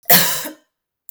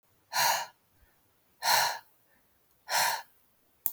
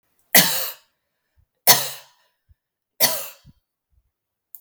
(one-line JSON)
{"cough_length": "1.1 s", "cough_amplitude": 32768, "cough_signal_mean_std_ratio": 0.42, "exhalation_length": "3.9 s", "exhalation_amplitude": 18687, "exhalation_signal_mean_std_ratio": 0.41, "three_cough_length": "4.6 s", "three_cough_amplitude": 32768, "three_cough_signal_mean_std_ratio": 0.28, "survey_phase": "beta (2021-08-13 to 2022-03-07)", "age": "18-44", "gender": "Female", "wearing_mask": "No", "symptom_sore_throat": true, "symptom_fatigue": true, "symptom_headache": true, "symptom_onset": "12 days", "smoker_status": "Ex-smoker", "respiratory_condition_asthma": false, "respiratory_condition_other": false, "recruitment_source": "REACT", "submission_delay": "2 days", "covid_test_result": "Negative", "covid_test_method": "RT-qPCR", "influenza_a_test_result": "Negative", "influenza_b_test_result": "Negative"}